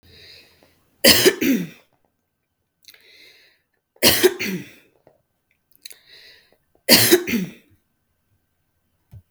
{"three_cough_length": "9.3 s", "three_cough_amplitude": 32768, "three_cough_signal_mean_std_ratio": 0.31, "survey_phase": "beta (2021-08-13 to 2022-03-07)", "age": "45-64", "gender": "Female", "wearing_mask": "No", "symptom_none": true, "smoker_status": "Never smoked", "respiratory_condition_asthma": false, "respiratory_condition_other": false, "recruitment_source": "REACT", "submission_delay": "5 days", "covid_test_result": "Negative", "covid_test_method": "RT-qPCR", "influenza_a_test_result": "Unknown/Void", "influenza_b_test_result": "Unknown/Void"}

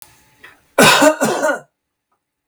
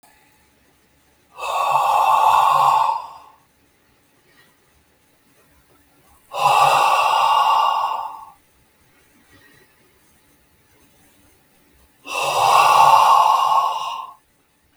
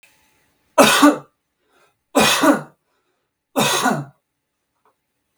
{"cough_length": "2.5 s", "cough_amplitude": 32768, "cough_signal_mean_std_ratio": 0.44, "exhalation_length": "14.8 s", "exhalation_amplitude": 32475, "exhalation_signal_mean_std_ratio": 0.51, "three_cough_length": "5.4 s", "three_cough_amplitude": 32768, "three_cough_signal_mean_std_ratio": 0.38, "survey_phase": "beta (2021-08-13 to 2022-03-07)", "age": "45-64", "gender": "Male", "wearing_mask": "No", "symptom_none": true, "smoker_status": "Ex-smoker", "respiratory_condition_asthma": false, "respiratory_condition_other": false, "recruitment_source": "REACT", "submission_delay": "3 days", "covid_test_result": "Negative", "covid_test_method": "RT-qPCR", "influenza_a_test_result": "Unknown/Void", "influenza_b_test_result": "Unknown/Void"}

